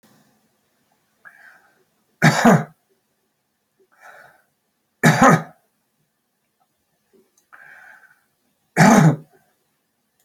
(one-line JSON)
{"three_cough_length": "10.2 s", "three_cough_amplitude": 32767, "three_cough_signal_mean_std_ratio": 0.27, "survey_phase": "beta (2021-08-13 to 2022-03-07)", "age": "65+", "gender": "Male", "wearing_mask": "No", "symptom_cough_any": true, "smoker_status": "Never smoked", "respiratory_condition_asthma": true, "respiratory_condition_other": false, "recruitment_source": "Test and Trace", "submission_delay": "2 days", "covid_test_result": "Positive", "covid_test_method": "ePCR"}